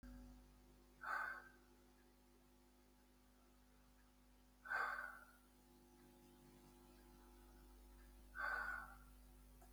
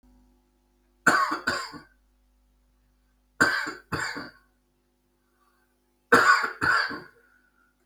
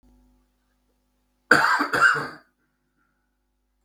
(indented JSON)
{
  "exhalation_length": "9.7 s",
  "exhalation_amplitude": 840,
  "exhalation_signal_mean_std_ratio": 0.5,
  "three_cough_length": "7.9 s",
  "three_cough_amplitude": 25096,
  "three_cough_signal_mean_std_ratio": 0.35,
  "cough_length": "3.8 s",
  "cough_amplitude": 32767,
  "cough_signal_mean_std_ratio": 0.32,
  "survey_phase": "beta (2021-08-13 to 2022-03-07)",
  "age": "65+",
  "gender": "Male",
  "wearing_mask": "No",
  "symptom_none": true,
  "smoker_status": "Never smoked",
  "respiratory_condition_asthma": false,
  "respiratory_condition_other": false,
  "recruitment_source": "Test and Trace",
  "submission_delay": "0 days",
  "covid_test_result": "Negative",
  "covid_test_method": "LFT"
}